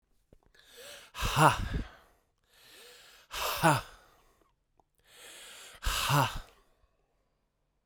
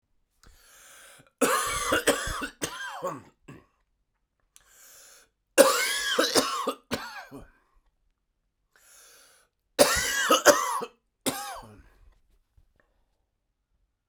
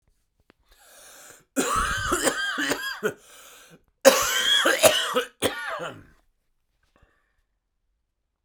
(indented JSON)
{
  "exhalation_length": "7.9 s",
  "exhalation_amplitude": 14402,
  "exhalation_signal_mean_std_ratio": 0.35,
  "three_cough_length": "14.1 s",
  "three_cough_amplitude": 30679,
  "three_cough_signal_mean_std_ratio": 0.37,
  "cough_length": "8.4 s",
  "cough_amplitude": 32767,
  "cough_signal_mean_std_ratio": 0.44,
  "survey_phase": "beta (2021-08-13 to 2022-03-07)",
  "age": "45-64",
  "gender": "Male",
  "wearing_mask": "No",
  "symptom_cough_any": true,
  "symptom_new_continuous_cough": true,
  "symptom_runny_or_blocked_nose": true,
  "symptom_sore_throat": true,
  "symptom_diarrhoea": true,
  "symptom_fatigue": true,
  "symptom_fever_high_temperature": true,
  "symptom_headache": true,
  "symptom_other": true,
  "symptom_onset": "3 days",
  "smoker_status": "Never smoked",
  "respiratory_condition_asthma": false,
  "respiratory_condition_other": false,
  "recruitment_source": "Test and Trace",
  "submission_delay": "2 days",
  "covid_test_result": "Positive",
  "covid_test_method": "RT-qPCR"
}